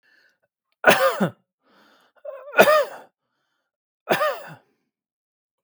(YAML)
three_cough_length: 5.6 s
three_cough_amplitude: 32766
three_cough_signal_mean_std_ratio: 0.32
survey_phase: beta (2021-08-13 to 2022-03-07)
age: 45-64
gender: Male
wearing_mask: 'No'
symptom_none: true
symptom_onset: 12 days
smoker_status: Ex-smoker
respiratory_condition_asthma: false
respiratory_condition_other: false
recruitment_source: REACT
submission_delay: 1 day
covid_test_result: Negative
covid_test_method: RT-qPCR